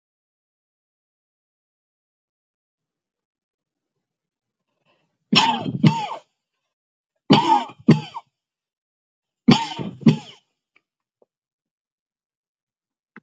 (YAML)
three_cough_length: 13.2 s
three_cough_amplitude: 29385
three_cough_signal_mean_std_ratio: 0.24
survey_phase: beta (2021-08-13 to 2022-03-07)
age: 45-64
gender: Female
wearing_mask: 'No'
symptom_none: true
smoker_status: Never smoked
respiratory_condition_asthma: false
respiratory_condition_other: false
recruitment_source: REACT
submission_delay: 2 days
covid_test_result: Negative
covid_test_method: RT-qPCR